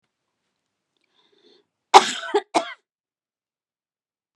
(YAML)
cough_length: 4.4 s
cough_amplitude: 32768
cough_signal_mean_std_ratio: 0.18
survey_phase: beta (2021-08-13 to 2022-03-07)
age: 65+
gender: Female
wearing_mask: 'No'
symptom_sore_throat: true
symptom_fatigue: true
symptom_headache: true
smoker_status: Ex-smoker
respiratory_condition_asthma: false
respiratory_condition_other: false
recruitment_source: REACT
submission_delay: 15 days
covid_test_result: Negative
covid_test_method: RT-qPCR